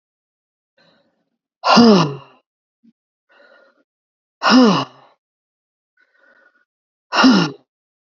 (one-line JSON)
{"exhalation_length": "8.2 s", "exhalation_amplitude": 32768, "exhalation_signal_mean_std_ratio": 0.31, "survey_phase": "alpha (2021-03-01 to 2021-08-12)", "age": "65+", "gender": "Female", "wearing_mask": "No", "symptom_cough_any": true, "symptom_onset": "5 days", "smoker_status": "Never smoked", "respiratory_condition_asthma": true, "respiratory_condition_other": false, "recruitment_source": "Test and Trace", "submission_delay": "1 day", "covid_test_result": "Positive", "covid_test_method": "RT-qPCR"}